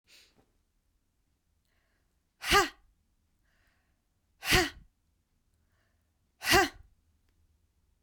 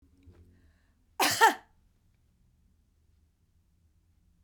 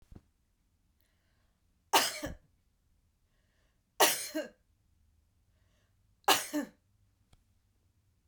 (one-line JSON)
{"exhalation_length": "8.0 s", "exhalation_amplitude": 11131, "exhalation_signal_mean_std_ratio": 0.23, "cough_length": "4.4 s", "cough_amplitude": 15073, "cough_signal_mean_std_ratio": 0.21, "three_cough_length": "8.3 s", "three_cough_amplitude": 10226, "three_cough_signal_mean_std_ratio": 0.24, "survey_phase": "beta (2021-08-13 to 2022-03-07)", "age": "45-64", "gender": "Female", "wearing_mask": "No", "symptom_none": true, "smoker_status": "Ex-smoker", "respiratory_condition_asthma": false, "respiratory_condition_other": false, "recruitment_source": "REACT", "submission_delay": "0 days", "covid_test_result": "Negative", "covid_test_method": "RT-qPCR"}